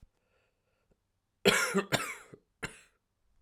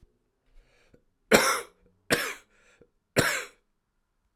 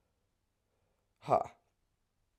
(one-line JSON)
{"cough_length": "3.4 s", "cough_amplitude": 14804, "cough_signal_mean_std_ratio": 0.31, "three_cough_length": "4.4 s", "three_cough_amplitude": 26635, "three_cough_signal_mean_std_ratio": 0.3, "exhalation_length": "2.4 s", "exhalation_amplitude": 5932, "exhalation_signal_mean_std_ratio": 0.19, "survey_phase": "alpha (2021-03-01 to 2021-08-12)", "age": "18-44", "gender": "Female", "wearing_mask": "No", "symptom_cough_any": true, "symptom_new_continuous_cough": true, "symptom_shortness_of_breath": true, "symptom_fatigue": true, "symptom_fever_high_temperature": true, "symptom_headache": true, "smoker_status": "Never smoked", "respiratory_condition_asthma": false, "respiratory_condition_other": false, "recruitment_source": "Test and Trace", "submission_delay": "2 days", "covid_test_result": "Positive", "covid_test_method": "ePCR"}